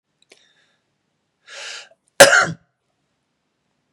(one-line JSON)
{"cough_length": "3.9 s", "cough_amplitude": 32768, "cough_signal_mean_std_ratio": 0.21, "survey_phase": "beta (2021-08-13 to 2022-03-07)", "age": "45-64", "gender": "Male", "wearing_mask": "No", "symptom_none": true, "smoker_status": "Ex-smoker", "respiratory_condition_asthma": false, "respiratory_condition_other": false, "recruitment_source": "Test and Trace", "submission_delay": "0 days", "covid_test_result": "Negative", "covid_test_method": "LFT"}